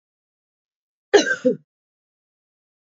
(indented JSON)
{
  "cough_length": "2.9 s",
  "cough_amplitude": 27919,
  "cough_signal_mean_std_ratio": 0.23,
  "survey_phase": "beta (2021-08-13 to 2022-03-07)",
  "age": "18-44",
  "gender": "Female",
  "wearing_mask": "No",
  "symptom_runny_or_blocked_nose": true,
  "symptom_fatigue": true,
  "symptom_change_to_sense_of_smell_or_taste": true,
  "symptom_loss_of_taste": true,
  "symptom_other": true,
  "symptom_onset": "3 days",
  "smoker_status": "Current smoker (1 to 10 cigarettes per day)",
  "respiratory_condition_asthma": false,
  "respiratory_condition_other": false,
  "recruitment_source": "Test and Trace",
  "submission_delay": "2 days",
  "covid_test_result": "Positive",
  "covid_test_method": "RT-qPCR",
  "covid_ct_value": 20.7,
  "covid_ct_gene": "N gene"
}